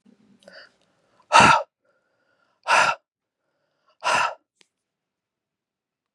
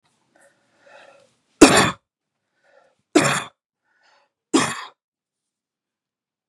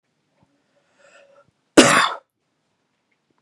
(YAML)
exhalation_length: 6.1 s
exhalation_amplitude: 30844
exhalation_signal_mean_std_ratio: 0.27
three_cough_length: 6.5 s
three_cough_amplitude: 32768
three_cough_signal_mean_std_ratio: 0.24
cough_length: 3.4 s
cough_amplitude: 32768
cough_signal_mean_std_ratio: 0.23
survey_phase: beta (2021-08-13 to 2022-03-07)
age: 18-44
gender: Male
wearing_mask: 'No'
symptom_none: true
smoker_status: Ex-smoker
respiratory_condition_asthma: false
respiratory_condition_other: false
recruitment_source: REACT
submission_delay: 0 days
covid_test_result: Negative
covid_test_method: RT-qPCR
influenza_a_test_result: Negative
influenza_b_test_result: Negative